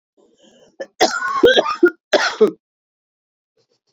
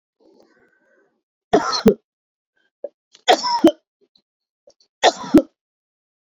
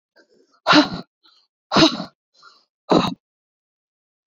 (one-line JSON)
{"cough_length": "3.9 s", "cough_amplitude": 27717, "cough_signal_mean_std_ratio": 0.39, "three_cough_length": "6.2 s", "three_cough_amplitude": 27428, "three_cough_signal_mean_std_ratio": 0.28, "exhalation_length": "4.4 s", "exhalation_amplitude": 26884, "exhalation_signal_mean_std_ratio": 0.31, "survey_phase": "beta (2021-08-13 to 2022-03-07)", "age": "45-64", "gender": "Female", "wearing_mask": "No", "symptom_cough_any": true, "symptom_onset": "11 days", "smoker_status": "Current smoker (e-cigarettes or vapes only)", "respiratory_condition_asthma": true, "respiratory_condition_other": false, "recruitment_source": "REACT", "submission_delay": "2 days", "covid_test_result": "Negative", "covid_test_method": "RT-qPCR"}